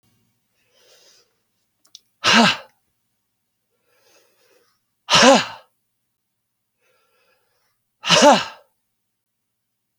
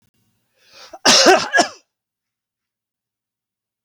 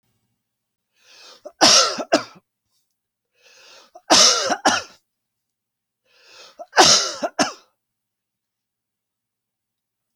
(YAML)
exhalation_length: 10.0 s
exhalation_amplitude: 32767
exhalation_signal_mean_std_ratio: 0.26
cough_length: 3.8 s
cough_amplitude: 32768
cough_signal_mean_std_ratio: 0.3
three_cough_length: 10.2 s
three_cough_amplitude: 32768
three_cough_signal_mean_std_ratio: 0.3
survey_phase: alpha (2021-03-01 to 2021-08-12)
age: 45-64
gender: Male
wearing_mask: 'No'
symptom_none: true
smoker_status: Ex-smoker
respiratory_condition_asthma: false
respiratory_condition_other: false
recruitment_source: REACT
submission_delay: 3 days
covid_test_result: Negative
covid_test_method: RT-qPCR